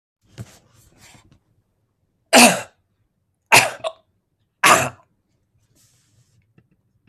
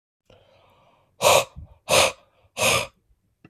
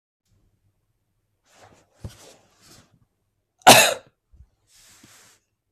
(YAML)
three_cough_length: 7.1 s
three_cough_amplitude: 32768
three_cough_signal_mean_std_ratio: 0.24
exhalation_length: 3.5 s
exhalation_amplitude: 24442
exhalation_signal_mean_std_ratio: 0.37
cough_length: 5.7 s
cough_amplitude: 32768
cough_signal_mean_std_ratio: 0.17
survey_phase: beta (2021-08-13 to 2022-03-07)
age: 18-44
gender: Male
wearing_mask: 'No'
symptom_cough_any: true
symptom_runny_or_blocked_nose: true
symptom_onset: 3 days
smoker_status: Ex-smoker
respiratory_condition_asthma: false
respiratory_condition_other: false
recruitment_source: REACT
submission_delay: 4 days
covid_test_result: Negative
covid_test_method: RT-qPCR
influenza_a_test_result: Negative
influenza_b_test_result: Negative